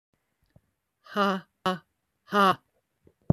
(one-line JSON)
{"exhalation_length": "3.3 s", "exhalation_amplitude": 15372, "exhalation_signal_mean_std_ratio": 0.32, "survey_phase": "beta (2021-08-13 to 2022-03-07)", "age": "45-64", "gender": "Female", "wearing_mask": "No", "symptom_cough_any": true, "symptom_runny_or_blocked_nose": true, "symptom_onset": "4 days", "smoker_status": "Current smoker (11 or more cigarettes per day)", "respiratory_condition_asthma": false, "respiratory_condition_other": false, "recruitment_source": "REACT", "submission_delay": "1 day", "covid_test_result": "Negative", "covid_test_method": "RT-qPCR"}